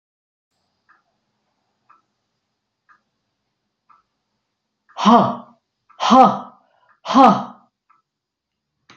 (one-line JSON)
{"exhalation_length": "9.0 s", "exhalation_amplitude": 28981, "exhalation_signal_mean_std_ratio": 0.26, "survey_phase": "beta (2021-08-13 to 2022-03-07)", "age": "65+", "gender": "Female", "wearing_mask": "No", "symptom_none": true, "smoker_status": "Never smoked", "respiratory_condition_asthma": false, "respiratory_condition_other": false, "recruitment_source": "REACT", "submission_delay": "1 day", "covid_test_result": "Negative", "covid_test_method": "RT-qPCR", "influenza_a_test_result": "Negative", "influenza_b_test_result": "Negative"}